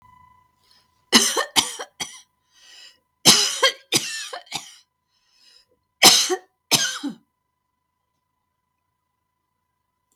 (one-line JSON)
{"three_cough_length": "10.2 s", "three_cough_amplitude": 32768, "three_cough_signal_mean_std_ratio": 0.3, "survey_phase": "beta (2021-08-13 to 2022-03-07)", "age": "65+", "gender": "Female", "wearing_mask": "No", "symptom_none": true, "smoker_status": "Never smoked", "respiratory_condition_asthma": false, "respiratory_condition_other": false, "recruitment_source": "REACT", "submission_delay": "1 day", "covid_test_result": "Negative", "covid_test_method": "RT-qPCR", "influenza_a_test_result": "Negative", "influenza_b_test_result": "Negative"}